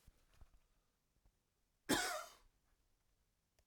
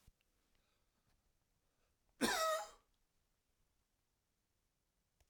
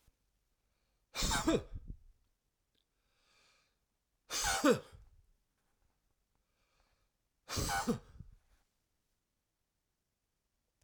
{"three_cough_length": "3.7 s", "three_cough_amplitude": 2664, "three_cough_signal_mean_std_ratio": 0.26, "cough_length": "5.3 s", "cough_amplitude": 2466, "cough_signal_mean_std_ratio": 0.25, "exhalation_length": "10.8 s", "exhalation_amplitude": 5331, "exhalation_signal_mean_std_ratio": 0.29, "survey_phase": "alpha (2021-03-01 to 2021-08-12)", "age": "65+", "gender": "Male", "wearing_mask": "No", "symptom_none": true, "smoker_status": "Ex-smoker", "respiratory_condition_asthma": false, "respiratory_condition_other": false, "recruitment_source": "REACT", "submission_delay": "2 days", "covid_test_result": "Negative", "covid_test_method": "RT-qPCR"}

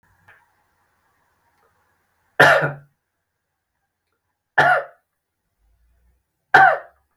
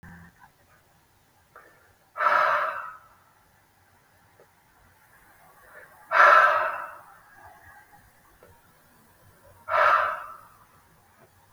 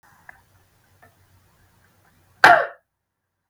{"three_cough_length": "7.2 s", "three_cough_amplitude": 32766, "three_cough_signal_mean_std_ratio": 0.26, "exhalation_length": "11.5 s", "exhalation_amplitude": 24096, "exhalation_signal_mean_std_ratio": 0.32, "cough_length": "3.5 s", "cough_amplitude": 32768, "cough_signal_mean_std_ratio": 0.19, "survey_phase": "beta (2021-08-13 to 2022-03-07)", "age": "45-64", "gender": "Male", "wearing_mask": "No", "symptom_runny_or_blocked_nose": true, "symptom_onset": "7 days", "smoker_status": "Never smoked", "respiratory_condition_asthma": false, "respiratory_condition_other": false, "recruitment_source": "REACT", "submission_delay": "3 days", "covid_test_result": "Negative", "covid_test_method": "RT-qPCR", "influenza_a_test_result": "Unknown/Void", "influenza_b_test_result": "Unknown/Void"}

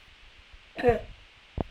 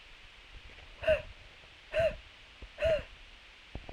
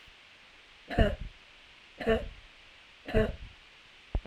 {"cough_length": "1.7 s", "cough_amplitude": 9168, "cough_signal_mean_std_ratio": 0.35, "exhalation_length": "3.9 s", "exhalation_amplitude": 5279, "exhalation_signal_mean_std_ratio": 0.44, "three_cough_length": "4.3 s", "three_cough_amplitude": 10823, "three_cough_signal_mean_std_ratio": 0.39, "survey_phase": "beta (2021-08-13 to 2022-03-07)", "age": "45-64", "gender": "Female", "wearing_mask": "No", "symptom_none": true, "symptom_onset": "3 days", "smoker_status": "Never smoked", "respiratory_condition_asthma": false, "respiratory_condition_other": false, "recruitment_source": "REACT", "submission_delay": "2 days", "covid_test_result": "Negative", "covid_test_method": "RT-qPCR"}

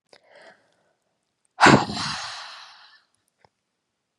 {"exhalation_length": "4.2 s", "exhalation_amplitude": 31387, "exhalation_signal_mean_std_ratio": 0.25, "survey_phase": "beta (2021-08-13 to 2022-03-07)", "age": "18-44", "gender": "Female", "wearing_mask": "No", "symptom_cough_any": true, "symptom_runny_or_blocked_nose": true, "symptom_fatigue": true, "symptom_headache": true, "symptom_onset": "3 days", "smoker_status": "Never smoked", "respiratory_condition_asthma": false, "respiratory_condition_other": false, "recruitment_source": "Test and Trace", "submission_delay": "2 days", "covid_test_result": "Positive", "covid_test_method": "ePCR"}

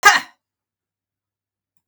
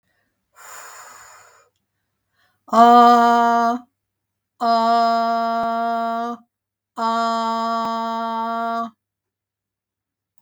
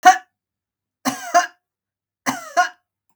{"cough_length": "1.9 s", "cough_amplitude": 32768, "cough_signal_mean_std_ratio": 0.22, "exhalation_length": "10.4 s", "exhalation_amplitude": 30535, "exhalation_signal_mean_std_ratio": 0.53, "three_cough_length": "3.2 s", "three_cough_amplitude": 32768, "three_cough_signal_mean_std_ratio": 0.3, "survey_phase": "beta (2021-08-13 to 2022-03-07)", "age": "65+", "gender": "Female", "wearing_mask": "No", "symptom_none": true, "smoker_status": "Ex-smoker", "respiratory_condition_asthma": false, "respiratory_condition_other": false, "recruitment_source": "REACT", "submission_delay": "32 days", "covid_test_result": "Negative", "covid_test_method": "RT-qPCR", "influenza_a_test_result": "Unknown/Void", "influenza_b_test_result": "Unknown/Void"}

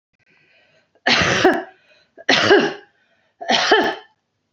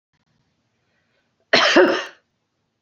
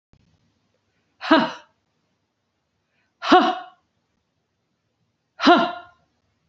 {"three_cough_length": "4.5 s", "three_cough_amplitude": 28397, "three_cough_signal_mean_std_ratio": 0.47, "cough_length": "2.8 s", "cough_amplitude": 27546, "cough_signal_mean_std_ratio": 0.33, "exhalation_length": "6.5 s", "exhalation_amplitude": 28365, "exhalation_signal_mean_std_ratio": 0.26, "survey_phase": "beta (2021-08-13 to 2022-03-07)", "age": "45-64", "gender": "Female", "wearing_mask": "No", "symptom_none": true, "smoker_status": "Never smoked", "respiratory_condition_asthma": false, "respiratory_condition_other": false, "recruitment_source": "REACT", "submission_delay": "1 day", "covid_test_result": "Negative", "covid_test_method": "RT-qPCR"}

